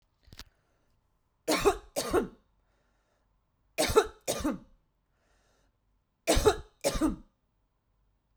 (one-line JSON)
{"three_cough_length": "8.4 s", "three_cough_amplitude": 12387, "three_cough_signal_mean_std_ratio": 0.33, "survey_phase": "beta (2021-08-13 to 2022-03-07)", "age": "45-64", "gender": "Female", "wearing_mask": "No", "symptom_none": true, "smoker_status": "Never smoked", "respiratory_condition_asthma": false, "respiratory_condition_other": false, "recruitment_source": "REACT", "submission_delay": "1 day", "covid_test_result": "Negative", "covid_test_method": "RT-qPCR"}